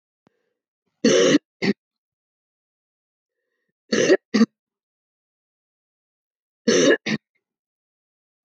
{
  "three_cough_length": "8.4 s",
  "three_cough_amplitude": 20087,
  "three_cough_signal_mean_std_ratio": 0.3,
  "survey_phase": "beta (2021-08-13 to 2022-03-07)",
  "age": "45-64",
  "gender": "Female",
  "wearing_mask": "No",
  "symptom_cough_any": true,
  "symptom_new_continuous_cough": true,
  "symptom_runny_or_blocked_nose": true,
  "symptom_sore_throat": true,
  "smoker_status": "Never smoked",
  "respiratory_condition_asthma": false,
  "respiratory_condition_other": false,
  "recruitment_source": "Test and Trace",
  "submission_delay": "2 days",
  "covid_test_result": "Positive",
  "covid_test_method": "RT-qPCR",
  "covid_ct_value": 14.8,
  "covid_ct_gene": "N gene"
}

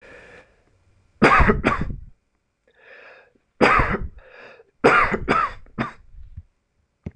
{
  "three_cough_length": "7.2 s",
  "three_cough_amplitude": 26028,
  "three_cough_signal_mean_std_ratio": 0.41,
  "survey_phase": "beta (2021-08-13 to 2022-03-07)",
  "age": "18-44",
  "gender": "Male",
  "wearing_mask": "No",
  "symptom_none": true,
  "symptom_onset": "13 days",
  "smoker_status": "Never smoked",
  "respiratory_condition_asthma": true,
  "respiratory_condition_other": false,
  "recruitment_source": "REACT",
  "submission_delay": "2 days",
  "covid_test_result": "Positive",
  "covid_test_method": "RT-qPCR",
  "covid_ct_value": 36.0,
  "covid_ct_gene": "N gene",
  "influenza_a_test_result": "Negative",
  "influenza_b_test_result": "Negative"
}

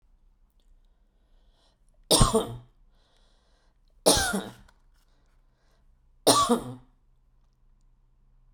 {
  "three_cough_length": "8.5 s",
  "three_cough_amplitude": 22647,
  "three_cough_signal_mean_std_ratio": 0.29,
  "survey_phase": "beta (2021-08-13 to 2022-03-07)",
  "age": "45-64",
  "gender": "Female",
  "wearing_mask": "No",
  "symptom_none": true,
  "smoker_status": "Ex-smoker",
  "respiratory_condition_asthma": false,
  "respiratory_condition_other": false,
  "recruitment_source": "REACT",
  "submission_delay": "3 days",
  "covid_test_result": "Negative",
  "covid_test_method": "RT-qPCR",
  "influenza_a_test_result": "Negative",
  "influenza_b_test_result": "Negative"
}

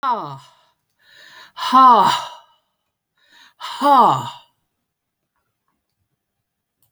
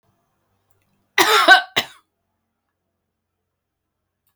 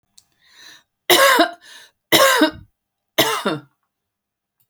{
  "exhalation_length": "6.9 s",
  "exhalation_amplitude": 28979,
  "exhalation_signal_mean_std_ratio": 0.34,
  "cough_length": "4.4 s",
  "cough_amplitude": 31438,
  "cough_signal_mean_std_ratio": 0.25,
  "three_cough_length": "4.7 s",
  "three_cough_amplitude": 32768,
  "three_cough_signal_mean_std_ratio": 0.39,
  "survey_phase": "beta (2021-08-13 to 2022-03-07)",
  "age": "65+",
  "gender": "Female",
  "wearing_mask": "No",
  "symptom_none": true,
  "smoker_status": "Ex-smoker",
  "respiratory_condition_asthma": false,
  "respiratory_condition_other": false,
  "recruitment_source": "REACT",
  "submission_delay": "3 days",
  "covid_test_result": "Negative",
  "covid_test_method": "RT-qPCR"
}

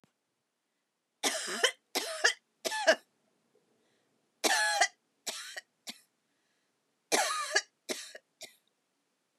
{
  "three_cough_length": "9.4 s",
  "three_cough_amplitude": 11967,
  "three_cough_signal_mean_std_ratio": 0.35,
  "survey_phase": "beta (2021-08-13 to 2022-03-07)",
  "age": "65+",
  "gender": "Female",
  "wearing_mask": "No",
  "symptom_none": true,
  "smoker_status": "Never smoked",
  "respiratory_condition_asthma": false,
  "respiratory_condition_other": false,
  "recruitment_source": "REACT",
  "submission_delay": "0 days",
  "covid_test_result": "Negative",
  "covid_test_method": "RT-qPCR",
  "influenza_a_test_result": "Negative",
  "influenza_b_test_result": "Negative"
}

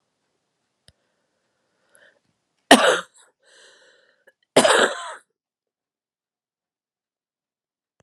{
  "cough_length": "8.0 s",
  "cough_amplitude": 32768,
  "cough_signal_mean_std_ratio": 0.21,
  "survey_phase": "beta (2021-08-13 to 2022-03-07)",
  "age": "65+",
  "gender": "Female",
  "wearing_mask": "No",
  "symptom_cough_any": true,
  "symptom_runny_or_blocked_nose": true,
  "symptom_fatigue": true,
  "symptom_fever_high_temperature": true,
  "symptom_change_to_sense_of_smell_or_taste": true,
  "symptom_onset": "5 days",
  "smoker_status": "Never smoked",
  "respiratory_condition_asthma": true,
  "respiratory_condition_other": false,
  "recruitment_source": "Test and Trace",
  "submission_delay": "2 days",
  "covid_test_result": "Positive",
  "covid_test_method": "RT-qPCR",
  "covid_ct_value": 25.9,
  "covid_ct_gene": "ORF1ab gene"
}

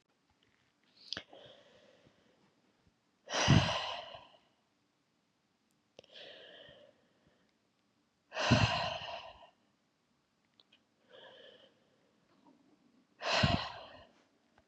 {
  "exhalation_length": "14.7 s",
  "exhalation_amplitude": 7565,
  "exhalation_signal_mean_std_ratio": 0.29,
  "survey_phase": "beta (2021-08-13 to 2022-03-07)",
  "age": "45-64",
  "gender": "Female",
  "wearing_mask": "No",
  "symptom_cough_any": true,
  "symptom_runny_or_blocked_nose": true,
  "symptom_shortness_of_breath": true,
  "symptom_sore_throat": true,
  "symptom_fatigue": true,
  "symptom_headache": true,
  "symptom_onset": "6 days",
  "smoker_status": "Never smoked",
  "respiratory_condition_asthma": false,
  "respiratory_condition_other": false,
  "recruitment_source": "Test and Trace",
  "submission_delay": "1 day",
  "covid_test_result": "Positive",
  "covid_test_method": "RT-qPCR",
  "covid_ct_value": 24.0,
  "covid_ct_gene": "N gene"
}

